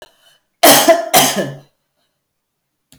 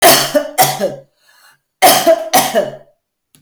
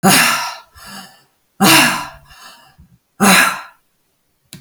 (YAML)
cough_length: 3.0 s
cough_amplitude: 32768
cough_signal_mean_std_ratio: 0.4
three_cough_length: 3.4 s
three_cough_amplitude: 32768
three_cough_signal_mean_std_ratio: 0.55
exhalation_length: 4.6 s
exhalation_amplitude: 32768
exhalation_signal_mean_std_ratio: 0.45
survey_phase: alpha (2021-03-01 to 2021-08-12)
age: 45-64
gender: Female
wearing_mask: 'No'
symptom_none: true
smoker_status: Ex-smoker
respiratory_condition_asthma: false
respiratory_condition_other: false
recruitment_source: REACT
submission_delay: 7 days
covid_test_result: Negative
covid_test_method: RT-qPCR